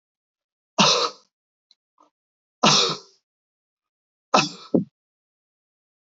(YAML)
three_cough_length: 6.1 s
three_cough_amplitude: 26709
three_cough_signal_mean_std_ratio: 0.29
survey_phase: alpha (2021-03-01 to 2021-08-12)
age: 65+
gender: Male
wearing_mask: 'No'
symptom_none: true
smoker_status: Never smoked
respiratory_condition_asthma: false
respiratory_condition_other: false
recruitment_source: REACT
submission_delay: 1 day
covid_test_result: Negative
covid_test_method: RT-qPCR